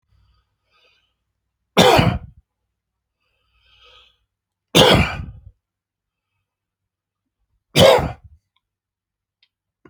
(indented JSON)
{
  "three_cough_length": "9.9 s",
  "three_cough_amplitude": 32767,
  "three_cough_signal_mean_std_ratio": 0.27,
  "survey_phase": "alpha (2021-03-01 to 2021-08-12)",
  "age": "65+",
  "gender": "Male",
  "wearing_mask": "No",
  "symptom_none": true,
  "symptom_shortness_of_breath": true,
  "smoker_status": "Never smoked",
  "respiratory_condition_asthma": false,
  "respiratory_condition_other": true,
  "recruitment_source": "REACT",
  "submission_delay": "2 days",
  "covid_test_result": "Negative",
  "covid_test_method": "RT-qPCR"
}